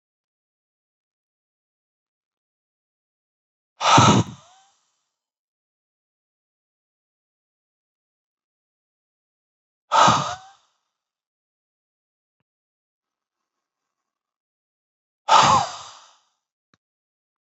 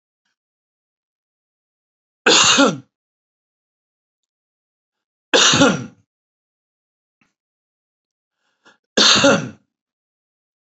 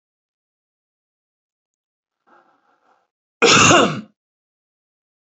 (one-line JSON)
{"exhalation_length": "17.4 s", "exhalation_amplitude": 27712, "exhalation_signal_mean_std_ratio": 0.21, "three_cough_length": "10.8 s", "three_cough_amplitude": 32768, "three_cough_signal_mean_std_ratio": 0.29, "cough_length": "5.2 s", "cough_amplitude": 32220, "cough_signal_mean_std_ratio": 0.26, "survey_phase": "alpha (2021-03-01 to 2021-08-12)", "age": "65+", "gender": "Male", "wearing_mask": "No", "symptom_none": true, "smoker_status": "Ex-smoker", "respiratory_condition_asthma": true, "respiratory_condition_other": false, "recruitment_source": "REACT", "submission_delay": "1 day", "covid_test_result": "Negative", "covid_test_method": "RT-qPCR"}